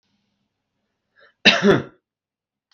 {"cough_length": "2.7 s", "cough_amplitude": 32768, "cough_signal_mean_std_ratio": 0.26, "survey_phase": "beta (2021-08-13 to 2022-03-07)", "age": "45-64", "gender": "Male", "wearing_mask": "No", "symptom_none": true, "smoker_status": "Ex-smoker", "respiratory_condition_asthma": false, "respiratory_condition_other": false, "recruitment_source": "REACT", "submission_delay": "1 day", "covid_test_result": "Negative", "covid_test_method": "RT-qPCR"}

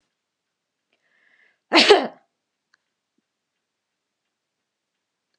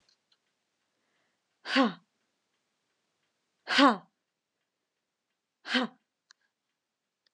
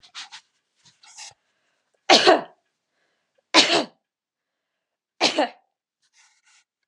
{"cough_length": "5.4 s", "cough_amplitude": 32734, "cough_signal_mean_std_ratio": 0.18, "exhalation_length": "7.3 s", "exhalation_amplitude": 13704, "exhalation_signal_mean_std_ratio": 0.21, "three_cough_length": "6.9 s", "three_cough_amplitude": 31334, "three_cough_signal_mean_std_ratio": 0.26, "survey_phase": "beta (2021-08-13 to 2022-03-07)", "age": "18-44", "gender": "Female", "wearing_mask": "No", "symptom_none": true, "smoker_status": "Never smoked", "respiratory_condition_asthma": false, "respiratory_condition_other": false, "recruitment_source": "REACT", "submission_delay": "1 day", "covid_test_result": "Negative", "covid_test_method": "RT-qPCR"}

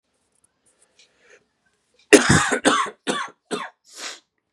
{"cough_length": "4.5 s", "cough_amplitude": 32768, "cough_signal_mean_std_ratio": 0.32, "survey_phase": "beta (2021-08-13 to 2022-03-07)", "age": "18-44", "gender": "Male", "wearing_mask": "No", "symptom_cough_any": true, "symptom_new_continuous_cough": true, "symptom_runny_or_blocked_nose": true, "symptom_sore_throat": true, "symptom_headache": true, "symptom_onset": "4 days", "smoker_status": "Never smoked", "respiratory_condition_asthma": false, "respiratory_condition_other": false, "recruitment_source": "Test and Trace", "submission_delay": "1 day", "covid_test_method": "RT-qPCR", "covid_ct_value": 30.2, "covid_ct_gene": "ORF1ab gene", "covid_ct_mean": 30.7, "covid_viral_load": "85 copies/ml", "covid_viral_load_category": "Minimal viral load (< 10K copies/ml)"}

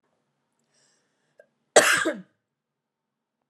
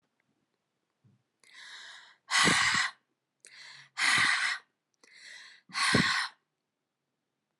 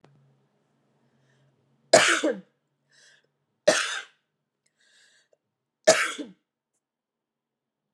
{"cough_length": "3.5 s", "cough_amplitude": 28364, "cough_signal_mean_std_ratio": 0.23, "exhalation_length": "7.6 s", "exhalation_amplitude": 8502, "exhalation_signal_mean_std_ratio": 0.41, "three_cough_length": "7.9 s", "three_cough_amplitude": 26792, "three_cough_signal_mean_std_ratio": 0.24, "survey_phase": "beta (2021-08-13 to 2022-03-07)", "age": "45-64", "gender": "Female", "wearing_mask": "No", "symptom_cough_any": true, "symptom_runny_or_blocked_nose": true, "smoker_status": "Never smoked", "respiratory_condition_asthma": false, "respiratory_condition_other": false, "recruitment_source": "Test and Trace", "submission_delay": "2 days", "covid_test_result": "Positive", "covid_test_method": "RT-qPCR"}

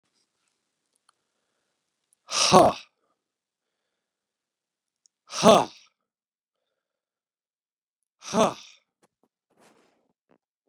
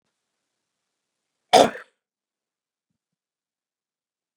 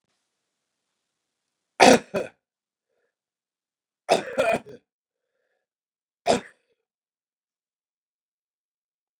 {"exhalation_length": "10.7 s", "exhalation_amplitude": 28680, "exhalation_signal_mean_std_ratio": 0.19, "cough_length": "4.4 s", "cough_amplitude": 30800, "cough_signal_mean_std_ratio": 0.14, "three_cough_length": "9.2 s", "three_cough_amplitude": 31996, "three_cough_signal_mean_std_ratio": 0.19, "survey_phase": "beta (2021-08-13 to 2022-03-07)", "age": "65+", "gender": "Male", "wearing_mask": "No", "symptom_none": true, "smoker_status": "Current smoker (1 to 10 cigarettes per day)", "respiratory_condition_asthma": false, "respiratory_condition_other": false, "recruitment_source": "REACT", "submission_delay": "1 day", "covid_test_result": "Negative", "covid_test_method": "RT-qPCR", "influenza_a_test_result": "Negative", "influenza_b_test_result": "Negative"}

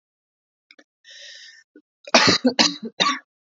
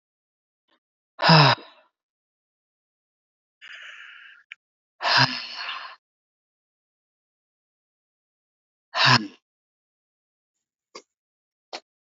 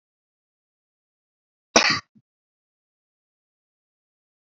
{"three_cough_length": "3.6 s", "three_cough_amplitude": 27991, "three_cough_signal_mean_std_ratio": 0.34, "exhalation_length": "12.0 s", "exhalation_amplitude": 26726, "exhalation_signal_mean_std_ratio": 0.23, "cough_length": "4.4 s", "cough_amplitude": 28768, "cough_signal_mean_std_ratio": 0.16, "survey_phase": "alpha (2021-03-01 to 2021-08-12)", "age": "18-44", "gender": "Male", "wearing_mask": "No", "symptom_cough_any": true, "symptom_fatigue": true, "symptom_fever_high_temperature": true, "symptom_change_to_sense_of_smell_or_taste": true, "symptom_loss_of_taste": true, "symptom_onset": "5 days", "smoker_status": "Never smoked", "respiratory_condition_asthma": false, "respiratory_condition_other": false, "recruitment_source": "Test and Trace", "submission_delay": "2 days", "covid_test_result": "Positive", "covid_test_method": "RT-qPCR", "covid_ct_value": 20.1, "covid_ct_gene": "N gene"}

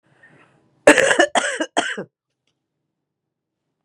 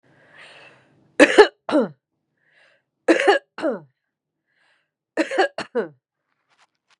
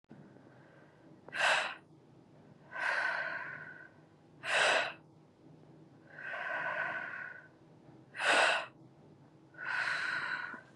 {"cough_length": "3.8 s", "cough_amplitude": 32768, "cough_signal_mean_std_ratio": 0.31, "three_cough_length": "7.0 s", "three_cough_amplitude": 32768, "three_cough_signal_mean_std_ratio": 0.29, "exhalation_length": "10.8 s", "exhalation_amplitude": 5529, "exhalation_signal_mean_std_ratio": 0.53, "survey_phase": "beta (2021-08-13 to 2022-03-07)", "age": "45-64", "gender": "Female", "wearing_mask": "No", "symptom_cough_any": true, "symptom_new_continuous_cough": true, "symptom_runny_or_blocked_nose": true, "symptom_onset": "3 days", "smoker_status": "Current smoker (1 to 10 cigarettes per day)", "respiratory_condition_asthma": true, "respiratory_condition_other": false, "recruitment_source": "Test and Trace", "submission_delay": "2 days", "covid_test_result": "Positive", "covid_test_method": "RT-qPCR", "covid_ct_value": 24.1, "covid_ct_gene": "N gene"}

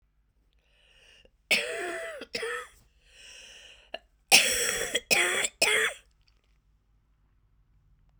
{"cough_length": "8.2 s", "cough_amplitude": 31282, "cough_signal_mean_std_ratio": 0.38, "survey_phase": "beta (2021-08-13 to 2022-03-07)", "age": "45-64", "gender": "Female", "wearing_mask": "No", "symptom_cough_any": true, "symptom_runny_or_blocked_nose": true, "symptom_shortness_of_breath": true, "symptom_sore_throat": true, "symptom_fatigue": true, "symptom_fever_high_temperature": true, "symptom_headache": true, "smoker_status": "Never smoked", "respiratory_condition_asthma": false, "respiratory_condition_other": false, "recruitment_source": "Test and Trace", "submission_delay": "2 days", "covid_test_result": "Positive", "covid_test_method": "RT-qPCR", "covid_ct_value": 15.7, "covid_ct_gene": "ORF1ab gene", "covid_ct_mean": 16.0, "covid_viral_load": "5500000 copies/ml", "covid_viral_load_category": "High viral load (>1M copies/ml)"}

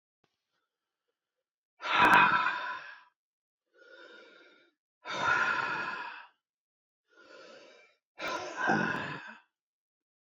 {"exhalation_length": "10.2 s", "exhalation_amplitude": 12164, "exhalation_signal_mean_std_ratio": 0.39, "survey_phase": "beta (2021-08-13 to 2022-03-07)", "age": "45-64", "gender": "Male", "wearing_mask": "No", "symptom_none": true, "smoker_status": "Ex-smoker", "respiratory_condition_asthma": false, "respiratory_condition_other": false, "recruitment_source": "REACT", "submission_delay": "0 days", "covid_test_result": "Negative", "covid_test_method": "RT-qPCR", "influenza_a_test_result": "Negative", "influenza_b_test_result": "Negative"}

